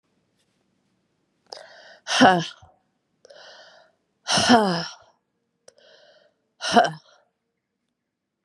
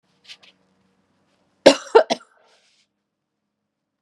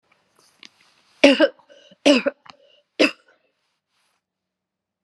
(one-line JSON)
{"exhalation_length": "8.4 s", "exhalation_amplitude": 30660, "exhalation_signal_mean_std_ratio": 0.28, "cough_length": "4.0 s", "cough_amplitude": 32768, "cough_signal_mean_std_ratio": 0.17, "three_cough_length": "5.0 s", "three_cough_amplitude": 32767, "three_cough_signal_mean_std_ratio": 0.25, "survey_phase": "beta (2021-08-13 to 2022-03-07)", "age": "45-64", "gender": "Female", "wearing_mask": "No", "symptom_runny_or_blocked_nose": true, "symptom_fatigue": true, "symptom_change_to_sense_of_smell_or_taste": true, "symptom_onset": "2 days", "smoker_status": "Never smoked", "respiratory_condition_asthma": false, "respiratory_condition_other": false, "recruitment_source": "Test and Trace", "submission_delay": "2 days", "covid_test_method": "RT-qPCR", "covid_ct_value": 39.5, "covid_ct_gene": "ORF1ab gene"}